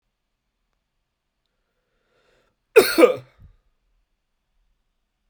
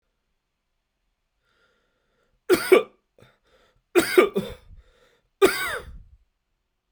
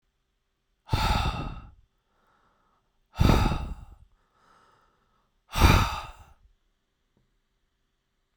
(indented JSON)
{
  "cough_length": "5.3 s",
  "cough_amplitude": 32768,
  "cough_signal_mean_std_ratio": 0.18,
  "three_cough_length": "6.9 s",
  "three_cough_amplitude": 26762,
  "three_cough_signal_mean_std_ratio": 0.27,
  "exhalation_length": "8.4 s",
  "exhalation_amplitude": 17195,
  "exhalation_signal_mean_std_ratio": 0.32,
  "survey_phase": "beta (2021-08-13 to 2022-03-07)",
  "age": "18-44",
  "gender": "Male",
  "wearing_mask": "No",
  "symptom_runny_or_blocked_nose": true,
  "symptom_diarrhoea": true,
  "symptom_fatigue": true,
  "symptom_fever_high_temperature": true,
  "symptom_headache": true,
  "smoker_status": "Never smoked",
  "respiratory_condition_asthma": false,
  "respiratory_condition_other": false,
  "recruitment_source": "Test and Trace",
  "submission_delay": "2 days",
  "covid_test_result": "Positive",
  "covid_test_method": "RT-qPCR",
  "covid_ct_value": 21.2,
  "covid_ct_gene": "ORF1ab gene",
  "covid_ct_mean": 22.5,
  "covid_viral_load": "43000 copies/ml",
  "covid_viral_load_category": "Low viral load (10K-1M copies/ml)"
}